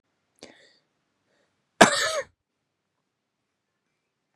{
  "cough_length": "4.4 s",
  "cough_amplitude": 32767,
  "cough_signal_mean_std_ratio": 0.18,
  "survey_phase": "beta (2021-08-13 to 2022-03-07)",
  "age": "45-64",
  "gender": "Male",
  "wearing_mask": "No",
  "symptom_none": true,
  "smoker_status": "Ex-smoker",
  "respiratory_condition_asthma": true,
  "respiratory_condition_other": false,
  "recruitment_source": "REACT",
  "submission_delay": "2 days",
  "covid_test_result": "Negative",
  "covid_test_method": "RT-qPCR"
}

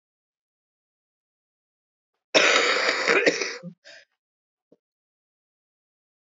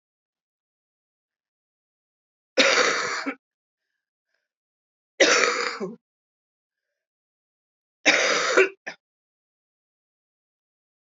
{
  "cough_length": "6.3 s",
  "cough_amplitude": 23956,
  "cough_signal_mean_std_ratio": 0.33,
  "three_cough_length": "11.0 s",
  "three_cough_amplitude": 24167,
  "three_cough_signal_mean_std_ratio": 0.31,
  "survey_phase": "beta (2021-08-13 to 2022-03-07)",
  "age": "45-64",
  "gender": "Female",
  "wearing_mask": "No",
  "symptom_cough_any": true,
  "symptom_shortness_of_breath": true,
  "symptom_fatigue": true,
  "symptom_onset": "3 days",
  "smoker_status": "Never smoked",
  "respiratory_condition_asthma": false,
  "respiratory_condition_other": false,
  "recruitment_source": "Test and Trace",
  "submission_delay": "1 day",
  "covid_test_result": "Negative",
  "covid_test_method": "RT-qPCR"
}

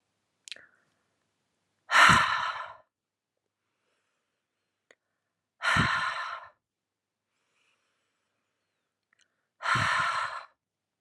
{
  "exhalation_length": "11.0 s",
  "exhalation_amplitude": 18941,
  "exhalation_signal_mean_std_ratio": 0.31,
  "survey_phase": "alpha (2021-03-01 to 2021-08-12)",
  "age": "18-44",
  "gender": "Female",
  "wearing_mask": "No",
  "symptom_fatigue": true,
  "symptom_onset": "3 days",
  "smoker_status": "Never smoked",
  "respiratory_condition_asthma": false,
  "respiratory_condition_other": false,
  "recruitment_source": "Test and Trace",
  "submission_delay": "2 days",
  "covid_test_result": "Positive",
  "covid_test_method": "RT-qPCR",
  "covid_ct_value": 15.9,
  "covid_ct_gene": "N gene",
  "covid_ct_mean": 16.2,
  "covid_viral_load": "5000000 copies/ml",
  "covid_viral_load_category": "High viral load (>1M copies/ml)"
}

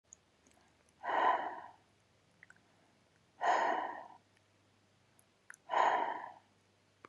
{
  "exhalation_length": "7.1 s",
  "exhalation_amplitude": 5188,
  "exhalation_signal_mean_std_ratio": 0.39,
  "survey_phase": "beta (2021-08-13 to 2022-03-07)",
  "age": "18-44",
  "gender": "Female",
  "wearing_mask": "No",
  "symptom_none": true,
  "smoker_status": "Ex-smoker",
  "respiratory_condition_asthma": false,
  "respiratory_condition_other": false,
  "recruitment_source": "REACT",
  "submission_delay": "6 days",
  "covid_test_result": "Negative",
  "covid_test_method": "RT-qPCR",
  "influenza_a_test_result": "Negative",
  "influenza_b_test_result": "Negative"
}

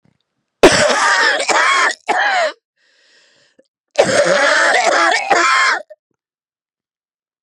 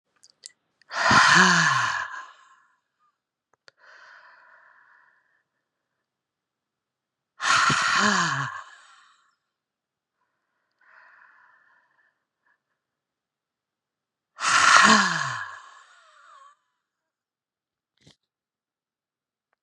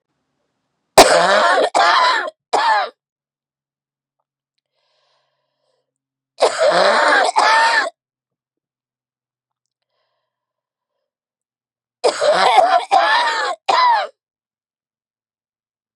{
  "cough_length": "7.4 s",
  "cough_amplitude": 32768,
  "cough_signal_mean_std_ratio": 0.61,
  "exhalation_length": "19.6 s",
  "exhalation_amplitude": 32716,
  "exhalation_signal_mean_std_ratio": 0.31,
  "three_cough_length": "16.0 s",
  "three_cough_amplitude": 32768,
  "three_cough_signal_mean_std_ratio": 0.45,
  "survey_phase": "beta (2021-08-13 to 2022-03-07)",
  "age": "45-64",
  "gender": "Female",
  "wearing_mask": "No",
  "symptom_cough_any": true,
  "symptom_runny_or_blocked_nose": true,
  "symptom_fatigue": true,
  "symptom_headache": true,
  "symptom_change_to_sense_of_smell_or_taste": true,
  "symptom_onset": "3 days",
  "smoker_status": "Ex-smoker",
  "respiratory_condition_asthma": false,
  "respiratory_condition_other": false,
  "recruitment_source": "Test and Trace",
  "submission_delay": "2 days",
  "covid_test_result": "Positive",
  "covid_test_method": "RT-qPCR",
  "covid_ct_value": 27.6,
  "covid_ct_gene": "ORF1ab gene"
}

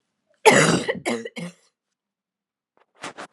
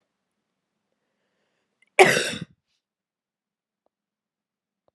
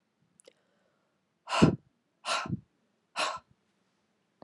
{
  "three_cough_length": "3.3 s",
  "three_cough_amplitude": 32040,
  "three_cough_signal_mean_std_ratio": 0.34,
  "cough_length": "4.9 s",
  "cough_amplitude": 29387,
  "cough_signal_mean_std_ratio": 0.17,
  "exhalation_length": "4.4 s",
  "exhalation_amplitude": 14104,
  "exhalation_signal_mean_std_ratio": 0.27,
  "survey_phase": "beta (2021-08-13 to 2022-03-07)",
  "age": "45-64",
  "gender": "Female",
  "wearing_mask": "No",
  "symptom_cough_any": true,
  "symptom_runny_or_blocked_nose": true,
  "symptom_fatigue": true,
  "symptom_headache": true,
  "symptom_onset": "2 days",
  "smoker_status": "Never smoked",
  "respiratory_condition_asthma": false,
  "respiratory_condition_other": false,
  "recruitment_source": "Test and Trace",
  "submission_delay": "2 days",
  "covid_test_result": "Positive",
  "covid_test_method": "RT-qPCR",
  "covid_ct_value": 18.1,
  "covid_ct_gene": "N gene",
  "covid_ct_mean": 18.4,
  "covid_viral_load": "930000 copies/ml",
  "covid_viral_load_category": "Low viral load (10K-1M copies/ml)"
}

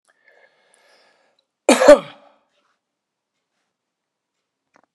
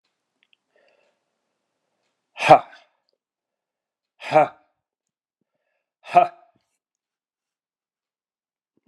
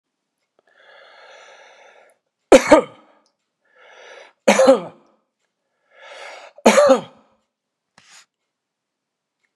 {
  "cough_length": "4.9 s",
  "cough_amplitude": 32768,
  "cough_signal_mean_std_ratio": 0.18,
  "exhalation_length": "8.9 s",
  "exhalation_amplitude": 32768,
  "exhalation_signal_mean_std_ratio": 0.17,
  "three_cough_length": "9.6 s",
  "three_cough_amplitude": 32768,
  "three_cough_signal_mean_std_ratio": 0.25,
  "survey_phase": "beta (2021-08-13 to 2022-03-07)",
  "age": "65+",
  "gender": "Male",
  "wearing_mask": "No",
  "symptom_none": true,
  "smoker_status": "Never smoked",
  "respiratory_condition_asthma": false,
  "respiratory_condition_other": false,
  "recruitment_source": "REACT",
  "submission_delay": "10 days",
  "covid_test_result": "Negative",
  "covid_test_method": "RT-qPCR"
}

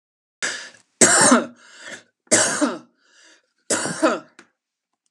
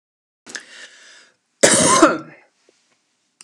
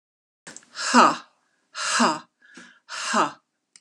{
  "three_cough_length": "5.1 s",
  "three_cough_amplitude": 32768,
  "three_cough_signal_mean_std_ratio": 0.41,
  "cough_length": "3.4 s",
  "cough_amplitude": 32768,
  "cough_signal_mean_std_ratio": 0.33,
  "exhalation_length": "3.8 s",
  "exhalation_amplitude": 28620,
  "exhalation_signal_mean_std_ratio": 0.39,
  "survey_phase": "alpha (2021-03-01 to 2021-08-12)",
  "age": "45-64",
  "gender": "Female",
  "wearing_mask": "No",
  "symptom_none": true,
  "smoker_status": "Ex-smoker",
  "respiratory_condition_asthma": false,
  "respiratory_condition_other": false,
  "recruitment_source": "REACT",
  "submission_delay": "1 day",
  "covid_test_result": "Negative",
  "covid_test_method": "RT-qPCR"
}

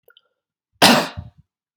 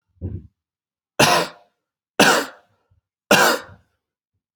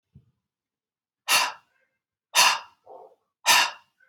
{
  "cough_length": "1.8 s",
  "cough_amplitude": 32768,
  "cough_signal_mean_std_ratio": 0.3,
  "three_cough_length": "4.6 s",
  "three_cough_amplitude": 32767,
  "three_cough_signal_mean_std_ratio": 0.35,
  "exhalation_length": "4.1 s",
  "exhalation_amplitude": 22006,
  "exhalation_signal_mean_std_ratio": 0.33,
  "survey_phase": "beta (2021-08-13 to 2022-03-07)",
  "age": "18-44",
  "gender": "Male",
  "wearing_mask": "No",
  "symptom_cough_any": true,
  "symptom_fatigue": true,
  "symptom_fever_high_temperature": true,
  "symptom_change_to_sense_of_smell_or_taste": true,
  "symptom_loss_of_taste": true,
  "symptom_other": true,
  "symptom_onset": "3 days",
  "smoker_status": "Ex-smoker",
  "respiratory_condition_asthma": false,
  "respiratory_condition_other": false,
  "recruitment_source": "Test and Trace",
  "submission_delay": "2 days",
  "covid_test_result": "Positive",
  "covid_test_method": "RT-qPCR",
  "covid_ct_value": 15.3,
  "covid_ct_gene": "ORF1ab gene",
  "covid_ct_mean": 15.7,
  "covid_viral_load": "7100000 copies/ml",
  "covid_viral_load_category": "High viral load (>1M copies/ml)"
}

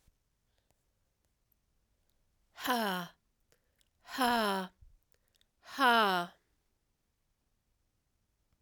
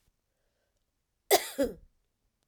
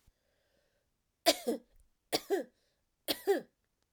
{
  "exhalation_length": "8.6 s",
  "exhalation_amplitude": 6452,
  "exhalation_signal_mean_std_ratio": 0.32,
  "cough_length": "2.5 s",
  "cough_amplitude": 14185,
  "cough_signal_mean_std_ratio": 0.24,
  "three_cough_length": "3.9 s",
  "three_cough_amplitude": 10543,
  "three_cough_signal_mean_std_ratio": 0.3,
  "survey_phase": "beta (2021-08-13 to 2022-03-07)",
  "age": "45-64",
  "gender": "Female",
  "wearing_mask": "No",
  "symptom_runny_or_blocked_nose": true,
  "symptom_sore_throat": true,
  "symptom_fatigue": true,
  "symptom_headache": true,
  "smoker_status": "Never smoked",
  "respiratory_condition_asthma": true,
  "respiratory_condition_other": false,
  "recruitment_source": "Test and Trace",
  "submission_delay": "2 days",
  "covid_test_result": "Positive",
  "covid_test_method": "LFT"
}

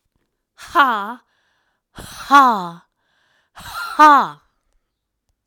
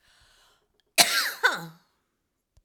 {
  "exhalation_length": "5.5 s",
  "exhalation_amplitude": 32768,
  "exhalation_signal_mean_std_ratio": 0.32,
  "cough_length": "2.6 s",
  "cough_amplitude": 32767,
  "cough_signal_mean_std_ratio": 0.31,
  "survey_phase": "alpha (2021-03-01 to 2021-08-12)",
  "age": "65+",
  "gender": "Female",
  "wearing_mask": "No",
  "symptom_none": true,
  "smoker_status": "Ex-smoker",
  "respiratory_condition_asthma": true,
  "respiratory_condition_other": false,
  "recruitment_source": "REACT",
  "submission_delay": "4 days",
  "covid_test_result": "Negative",
  "covid_test_method": "RT-qPCR"
}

